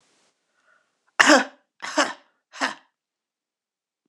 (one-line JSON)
{"three_cough_length": "4.1 s", "three_cough_amplitude": 26028, "three_cough_signal_mean_std_ratio": 0.25, "survey_phase": "beta (2021-08-13 to 2022-03-07)", "age": "45-64", "gender": "Female", "wearing_mask": "No", "symptom_cough_any": true, "symptom_runny_or_blocked_nose": true, "symptom_onset": "7 days", "smoker_status": "Never smoked", "respiratory_condition_asthma": false, "respiratory_condition_other": false, "recruitment_source": "Test and Trace", "submission_delay": "1 day", "covid_test_result": "Positive", "covid_test_method": "ePCR"}